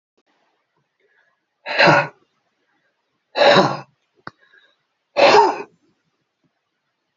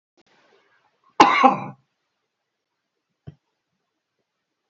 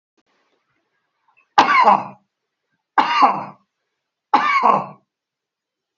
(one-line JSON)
{"exhalation_length": "7.2 s", "exhalation_amplitude": 32661, "exhalation_signal_mean_std_ratio": 0.32, "cough_length": "4.7 s", "cough_amplitude": 28135, "cough_signal_mean_std_ratio": 0.21, "three_cough_length": "6.0 s", "three_cough_amplitude": 28412, "three_cough_signal_mean_std_ratio": 0.38, "survey_phase": "beta (2021-08-13 to 2022-03-07)", "age": "45-64", "gender": "Male", "wearing_mask": "No", "symptom_none": true, "smoker_status": "Ex-smoker", "respiratory_condition_asthma": false, "respiratory_condition_other": true, "recruitment_source": "REACT", "submission_delay": "2 days", "covid_test_result": "Negative", "covid_test_method": "RT-qPCR"}